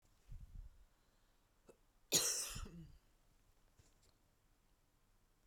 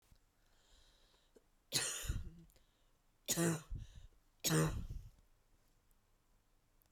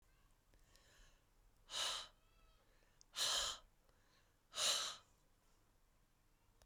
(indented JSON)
{
  "cough_length": "5.5 s",
  "cough_amplitude": 3437,
  "cough_signal_mean_std_ratio": 0.31,
  "three_cough_length": "6.9 s",
  "three_cough_amplitude": 3494,
  "three_cough_signal_mean_std_ratio": 0.38,
  "exhalation_length": "6.7 s",
  "exhalation_amplitude": 1953,
  "exhalation_signal_mean_std_ratio": 0.37,
  "survey_phase": "beta (2021-08-13 to 2022-03-07)",
  "age": "18-44",
  "gender": "Female",
  "wearing_mask": "No",
  "symptom_fatigue": true,
  "smoker_status": "Never smoked",
  "respiratory_condition_asthma": false,
  "respiratory_condition_other": false,
  "recruitment_source": "REACT",
  "submission_delay": "1 day",
  "covid_test_result": "Negative",
  "covid_test_method": "RT-qPCR"
}